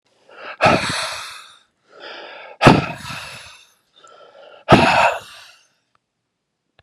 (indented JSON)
{
  "exhalation_length": "6.8 s",
  "exhalation_amplitude": 32768,
  "exhalation_signal_mean_std_ratio": 0.35,
  "survey_phase": "beta (2021-08-13 to 2022-03-07)",
  "age": "65+",
  "gender": "Male",
  "wearing_mask": "No",
  "symptom_cough_any": true,
  "symptom_shortness_of_breath": true,
  "symptom_fatigue": true,
  "symptom_fever_high_temperature": true,
  "symptom_headache": true,
  "symptom_change_to_sense_of_smell_or_taste": true,
  "symptom_loss_of_taste": true,
  "symptom_onset": "4 days",
  "smoker_status": "Never smoked",
  "respiratory_condition_asthma": false,
  "respiratory_condition_other": false,
  "recruitment_source": "Test and Trace",
  "submission_delay": "2 days",
  "covid_test_result": "Positive",
  "covid_test_method": "RT-qPCR"
}